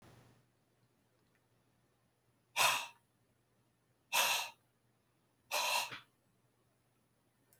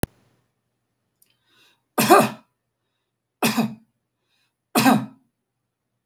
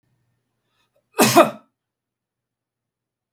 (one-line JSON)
{"exhalation_length": "7.6 s", "exhalation_amplitude": 4396, "exhalation_signal_mean_std_ratio": 0.3, "three_cough_length": "6.1 s", "three_cough_amplitude": 32530, "three_cough_signal_mean_std_ratio": 0.28, "cough_length": "3.3 s", "cough_amplitude": 32768, "cough_signal_mean_std_ratio": 0.22, "survey_phase": "beta (2021-08-13 to 2022-03-07)", "age": "65+", "gender": "Male", "wearing_mask": "No", "symptom_none": true, "smoker_status": "Ex-smoker", "respiratory_condition_asthma": false, "respiratory_condition_other": false, "recruitment_source": "REACT", "submission_delay": "1 day", "covid_test_result": "Negative", "covid_test_method": "RT-qPCR"}